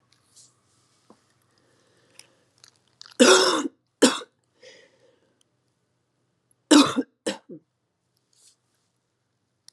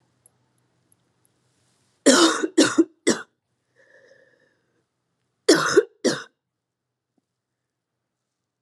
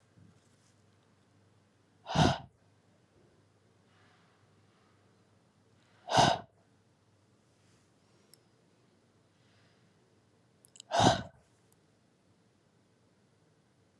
{"three_cough_length": "9.7 s", "three_cough_amplitude": 30399, "three_cough_signal_mean_std_ratio": 0.23, "cough_length": "8.6 s", "cough_amplitude": 28783, "cough_signal_mean_std_ratio": 0.28, "exhalation_length": "14.0 s", "exhalation_amplitude": 12531, "exhalation_signal_mean_std_ratio": 0.21, "survey_phase": "alpha (2021-03-01 to 2021-08-12)", "age": "18-44", "gender": "Female", "wearing_mask": "No", "symptom_cough_any": true, "symptom_fatigue": true, "symptom_fever_high_temperature": true, "symptom_headache": true, "symptom_onset": "11 days", "smoker_status": "Never smoked", "respiratory_condition_asthma": false, "respiratory_condition_other": false, "recruitment_source": "Test and Trace", "submission_delay": "1 day", "covid_test_result": "Positive", "covid_test_method": "RT-qPCR"}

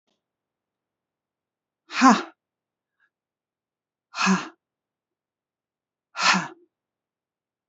{"exhalation_length": "7.7 s", "exhalation_amplitude": 28154, "exhalation_signal_mean_std_ratio": 0.23, "survey_phase": "alpha (2021-03-01 to 2021-08-12)", "age": "18-44", "gender": "Female", "wearing_mask": "No", "symptom_cough_any": true, "symptom_shortness_of_breath": true, "symptom_fatigue": true, "symptom_change_to_sense_of_smell_or_taste": true, "symptom_loss_of_taste": true, "symptom_onset": "7 days", "smoker_status": "Ex-smoker", "respiratory_condition_asthma": false, "respiratory_condition_other": false, "recruitment_source": "Test and Trace", "submission_delay": "2 days", "covid_test_result": "Positive", "covid_test_method": "RT-qPCR", "covid_ct_value": 18.9, "covid_ct_gene": "ORF1ab gene", "covid_ct_mean": 19.3, "covid_viral_load": "470000 copies/ml", "covid_viral_load_category": "Low viral load (10K-1M copies/ml)"}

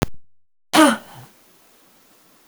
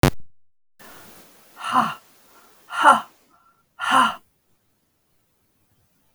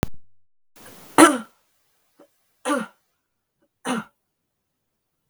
{"cough_length": "2.5 s", "cough_amplitude": 32766, "cough_signal_mean_std_ratio": 0.32, "exhalation_length": "6.1 s", "exhalation_amplitude": 32768, "exhalation_signal_mean_std_ratio": 0.31, "three_cough_length": "5.3 s", "three_cough_amplitude": 32768, "three_cough_signal_mean_std_ratio": 0.24, "survey_phase": "beta (2021-08-13 to 2022-03-07)", "age": "65+", "gender": "Female", "wearing_mask": "No", "symptom_cough_any": true, "symptom_runny_or_blocked_nose": true, "symptom_sore_throat": true, "symptom_fatigue": true, "smoker_status": "Ex-smoker", "respiratory_condition_asthma": false, "respiratory_condition_other": false, "recruitment_source": "Test and Trace", "submission_delay": "1 day", "covid_test_result": "Positive", "covid_test_method": "RT-qPCR", "covid_ct_value": 23.4, "covid_ct_gene": "ORF1ab gene"}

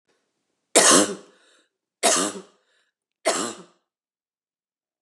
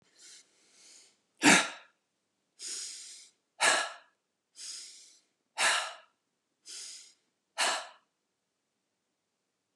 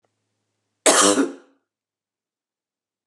{"three_cough_length": "5.0 s", "three_cough_amplitude": 26832, "three_cough_signal_mean_std_ratio": 0.32, "exhalation_length": "9.8 s", "exhalation_amplitude": 13040, "exhalation_signal_mean_std_ratio": 0.29, "cough_length": "3.1 s", "cough_amplitude": 29821, "cough_signal_mean_std_ratio": 0.29, "survey_phase": "beta (2021-08-13 to 2022-03-07)", "age": "45-64", "gender": "Female", "wearing_mask": "No", "symptom_none": true, "smoker_status": "Ex-smoker", "respiratory_condition_asthma": false, "respiratory_condition_other": true, "recruitment_source": "REACT", "submission_delay": "2 days", "covid_test_result": "Negative", "covid_test_method": "RT-qPCR", "influenza_a_test_result": "Negative", "influenza_b_test_result": "Negative"}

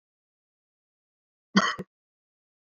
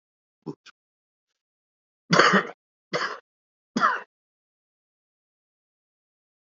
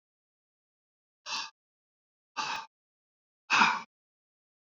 {"cough_length": "2.6 s", "cough_amplitude": 16463, "cough_signal_mean_std_ratio": 0.2, "three_cough_length": "6.5 s", "three_cough_amplitude": 25166, "three_cough_signal_mean_std_ratio": 0.25, "exhalation_length": "4.6 s", "exhalation_amplitude": 10730, "exhalation_signal_mean_std_ratio": 0.26, "survey_phase": "beta (2021-08-13 to 2022-03-07)", "age": "65+", "gender": "Male", "wearing_mask": "No", "symptom_none": true, "smoker_status": "Ex-smoker", "respiratory_condition_asthma": false, "respiratory_condition_other": false, "recruitment_source": "REACT", "submission_delay": "7 days", "covid_test_result": "Negative", "covid_test_method": "RT-qPCR", "influenza_a_test_result": "Negative", "influenza_b_test_result": "Negative"}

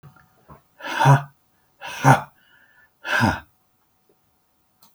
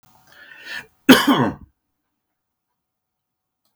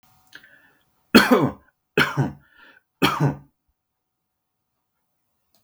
{"exhalation_length": "4.9 s", "exhalation_amplitude": 31398, "exhalation_signal_mean_std_ratio": 0.31, "cough_length": "3.8 s", "cough_amplitude": 32768, "cough_signal_mean_std_ratio": 0.25, "three_cough_length": "5.6 s", "three_cough_amplitude": 32768, "three_cough_signal_mean_std_ratio": 0.3, "survey_phase": "beta (2021-08-13 to 2022-03-07)", "age": "45-64", "gender": "Male", "wearing_mask": "No", "symptom_none": true, "smoker_status": "Never smoked", "respiratory_condition_asthma": false, "respiratory_condition_other": false, "recruitment_source": "REACT", "submission_delay": "5 days", "covid_test_result": "Negative", "covid_test_method": "RT-qPCR", "influenza_a_test_result": "Negative", "influenza_b_test_result": "Negative"}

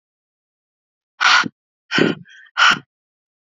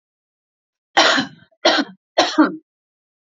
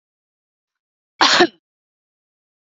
{"exhalation_length": "3.6 s", "exhalation_amplitude": 28617, "exhalation_signal_mean_std_ratio": 0.34, "three_cough_length": "3.3 s", "three_cough_amplitude": 30033, "three_cough_signal_mean_std_ratio": 0.38, "cough_length": "2.7 s", "cough_amplitude": 29620, "cough_signal_mean_std_ratio": 0.24, "survey_phase": "beta (2021-08-13 to 2022-03-07)", "age": "18-44", "gender": "Female", "wearing_mask": "No", "symptom_runny_or_blocked_nose": true, "symptom_other": true, "symptom_onset": "4 days", "smoker_status": "Ex-smoker", "respiratory_condition_asthma": false, "respiratory_condition_other": false, "recruitment_source": "Test and Trace", "submission_delay": "1 day", "covid_test_result": "Positive", "covid_test_method": "RT-qPCR"}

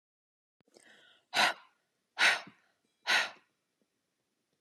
{"exhalation_length": "4.6 s", "exhalation_amplitude": 6991, "exhalation_signal_mean_std_ratio": 0.29, "survey_phase": "alpha (2021-03-01 to 2021-08-12)", "age": "65+", "gender": "Female", "wearing_mask": "No", "symptom_none": true, "smoker_status": "Ex-smoker", "respiratory_condition_asthma": false, "respiratory_condition_other": false, "recruitment_source": "REACT", "submission_delay": "2 days", "covid_test_result": "Negative", "covid_test_method": "RT-qPCR"}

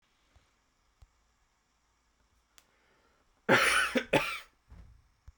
{"cough_length": "5.4 s", "cough_amplitude": 10315, "cough_signal_mean_std_ratio": 0.29, "survey_phase": "beta (2021-08-13 to 2022-03-07)", "age": "18-44", "gender": "Male", "wearing_mask": "No", "symptom_none": true, "smoker_status": "Never smoked", "respiratory_condition_asthma": false, "respiratory_condition_other": false, "recruitment_source": "REACT", "submission_delay": "3 days", "covid_test_result": "Negative", "covid_test_method": "RT-qPCR"}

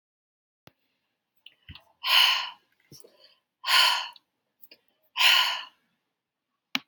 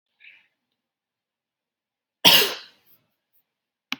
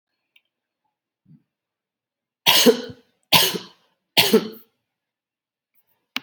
{"exhalation_length": "6.9 s", "exhalation_amplitude": 20397, "exhalation_signal_mean_std_ratio": 0.34, "cough_length": "4.0 s", "cough_amplitude": 32768, "cough_signal_mean_std_ratio": 0.2, "three_cough_length": "6.2 s", "three_cough_amplitude": 30853, "three_cough_signal_mean_std_ratio": 0.28, "survey_phase": "beta (2021-08-13 to 2022-03-07)", "age": "18-44", "gender": "Female", "wearing_mask": "No", "symptom_none": true, "smoker_status": "Never smoked", "respiratory_condition_asthma": false, "respiratory_condition_other": false, "recruitment_source": "REACT", "submission_delay": "2 days", "covid_test_result": "Negative", "covid_test_method": "RT-qPCR"}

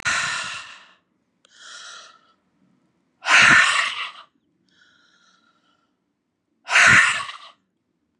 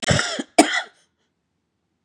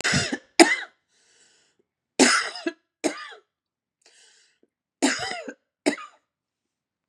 {"exhalation_length": "8.2 s", "exhalation_amplitude": 27757, "exhalation_signal_mean_std_ratio": 0.36, "cough_length": "2.0 s", "cough_amplitude": 32767, "cough_signal_mean_std_ratio": 0.35, "three_cough_length": "7.1 s", "three_cough_amplitude": 32678, "three_cough_signal_mean_std_ratio": 0.31, "survey_phase": "beta (2021-08-13 to 2022-03-07)", "age": "45-64", "gender": "Female", "wearing_mask": "No", "symptom_cough_any": true, "symptom_runny_or_blocked_nose": true, "symptom_fatigue": true, "symptom_fever_high_temperature": true, "symptom_headache": true, "symptom_onset": "4 days", "smoker_status": "Never smoked", "respiratory_condition_asthma": false, "respiratory_condition_other": false, "recruitment_source": "Test and Trace", "submission_delay": "2 days", "covid_test_result": "Positive", "covid_test_method": "RT-qPCR", "covid_ct_value": 22.6, "covid_ct_gene": "N gene"}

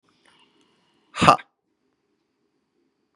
{"exhalation_length": "3.2 s", "exhalation_amplitude": 32768, "exhalation_signal_mean_std_ratio": 0.16, "survey_phase": "beta (2021-08-13 to 2022-03-07)", "age": "45-64", "gender": "Male", "wearing_mask": "No", "symptom_none": true, "smoker_status": "Ex-smoker", "respiratory_condition_asthma": false, "respiratory_condition_other": false, "recruitment_source": "REACT", "submission_delay": "7 days", "covid_test_result": "Negative", "covid_test_method": "RT-qPCR", "influenza_a_test_result": "Unknown/Void", "influenza_b_test_result": "Unknown/Void"}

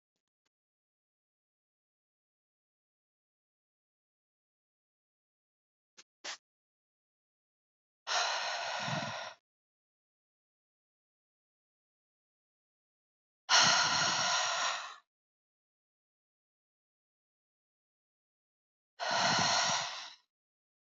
{"exhalation_length": "20.9 s", "exhalation_amplitude": 7807, "exhalation_signal_mean_std_ratio": 0.31, "survey_phase": "beta (2021-08-13 to 2022-03-07)", "age": "45-64", "gender": "Female", "wearing_mask": "No", "symptom_none": true, "smoker_status": "Never smoked", "respiratory_condition_asthma": false, "respiratory_condition_other": false, "recruitment_source": "REACT", "submission_delay": "1 day", "covid_test_result": "Negative", "covid_test_method": "RT-qPCR", "influenza_a_test_result": "Negative", "influenza_b_test_result": "Negative"}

